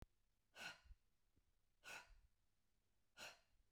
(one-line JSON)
{"exhalation_length": "3.7 s", "exhalation_amplitude": 264, "exhalation_signal_mean_std_ratio": 0.45, "survey_phase": "beta (2021-08-13 to 2022-03-07)", "age": "45-64", "gender": "Female", "wearing_mask": "No", "symptom_none": true, "smoker_status": "Ex-smoker", "respiratory_condition_asthma": false, "respiratory_condition_other": false, "recruitment_source": "REACT", "submission_delay": "5 days", "covid_test_result": "Negative", "covid_test_method": "RT-qPCR"}